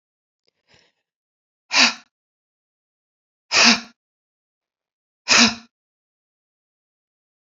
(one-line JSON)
{"exhalation_length": "7.5 s", "exhalation_amplitude": 32768, "exhalation_signal_mean_std_ratio": 0.24, "survey_phase": "beta (2021-08-13 to 2022-03-07)", "age": "18-44", "gender": "Female", "wearing_mask": "No", "symptom_cough_any": true, "symptom_onset": "3 days", "smoker_status": "Current smoker (e-cigarettes or vapes only)", "respiratory_condition_asthma": false, "respiratory_condition_other": false, "recruitment_source": "Test and Trace", "submission_delay": "1 day", "covid_test_result": "Negative", "covid_test_method": "RT-qPCR"}